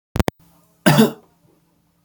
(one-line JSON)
{"cough_length": "2.0 s", "cough_amplitude": 29925, "cough_signal_mean_std_ratio": 0.3, "survey_phase": "beta (2021-08-13 to 2022-03-07)", "age": "18-44", "gender": "Male", "wearing_mask": "No", "symptom_cough_any": true, "symptom_runny_or_blocked_nose": true, "symptom_onset": "2 days", "smoker_status": "Never smoked", "respiratory_condition_asthma": false, "respiratory_condition_other": false, "recruitment_source": "Test and Trace", "submission_delay": "1 day", "covid_test_result": "Negative", "covid_test_method": "RT-qPCR"}